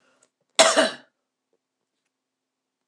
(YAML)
cough_length: 2.9 s
cough_amplitude: 26026
cough_signal_mean_std_ratio: 0.24
survey_phase: beta (2021-08-13 to 2022-03-07)
age: 45-64
gender: Female
wearing_mask: 'No'
symptom_cough_any: true
symptom_runny_or_blocked_nose: true
symptom_fatigue: true
symptom_onset: 8 days
smoker_status: Ex-smoker
respiratory_condition_asthma: false
respiratory_condition_other: false
recruitment_source: Test and Trace
submission_delay: 2 days
covid_test_result: Positive
covid_test_method: RT-qPCR